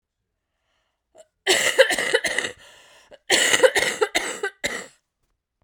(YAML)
cough_length: 5.6 s
cough_amplitude: 30636
cough_signal_mean_std_ratio: 0.44
survey_phase: beta (2021-08-13 to 2022-03-07)
age: 18-44
gender: Female
wearing_mask: 'No'
symptom_cough_any: true
symptom_runny_or_blocked_nose: true
symptom_fatigue: true
symptom_other: true
symptom_onset: 4 days
smoker_status: Never smoked
respiratory_condition_asthma: false
respiratory_condition_other: false
recruitment_source: Test and Trace
submission_delay: 1 day
covid_test_result: Positive
covid_test_method: RT-qPCR